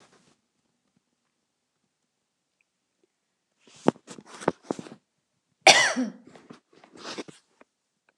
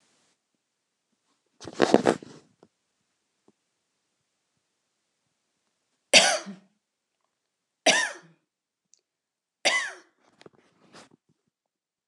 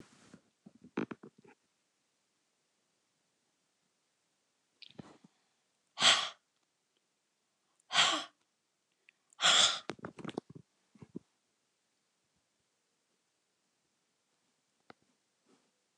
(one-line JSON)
{"cough_length": "8.2 s", "cough_amplitude": 29203, "cough_signal_mean_std_ratio": 0.19, "three_cough_length": "12.1 s", "three_cough_amplitude": 29196, "three_cough_signal_mean_std_ratio": 0.2, "exhalation_length": "16.0 s", "exhalation_amplitude": 9306, "exhalation_signal_mean_std_ratio": 0.21, "survey_phase": "alpha (2021-03-01 to 2021-08-12)", "age": "65+", "gender": "Female", "wearing_mask": "No", "symptom_none": true, "smoker_status": "Never smoked", "respiratory_condition_asthma": false, "respiratory_condition_other": false, "recruitment_source": "REACT", "submission_delay": "9 days", "covid_test_result": "Negative", "covid_test_method": "RT-qPCR"}